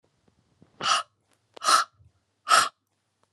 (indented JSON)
{
  "exhalation_length": "3.3 s",
  "exhalation_amplitude": 18041,
  "exhalation_signal_mean_std_ratio": 0.33,
  "survey_phase": "alpha (2021-03-01 to 2021-08-12)",
  "age": "45-64",
  "gender": "Female",
  "wearing_mask": "No",
  "symptom_none": true,
  "symptom_onset": "6 days",
  "smoker_status": "Never smoked",
  "respiratory_condition_asthma": false,
  "respiratory_condition_other": false,
  "recruitment_source": "REACT",
  "submission_delay": "1 day",
  "covid_test_result": "Negative",
  "covid_test_method": "RT-qPCR"
}